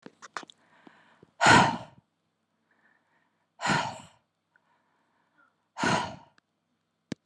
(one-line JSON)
{"exhalation_length": "7.3 s", "exhalation_amplitude": 19390, "exhalation_signal_mean_std_ratio": 0.27, "survey_phase": "beta (2021-08-13 to 2022-03-07)", "age": "18-44", "gender": "Female", "wearing_mask": "No", "symptom_sore_throat": true, "symptom_onset": "11 days", "smoker_status": "Current smoker (1 to 10 cigarettes per day)", "respiratory_condition_asthma": false, "respiratory_condition_other": false, "recruitment_source": "REACT", "submission_delay": "4 days", "covid_test_result": "Negative", "covid_test_method": "RT-qPCR", "influenza_a_test_result": "Negative", "influenza_b_test_result": "Negative"}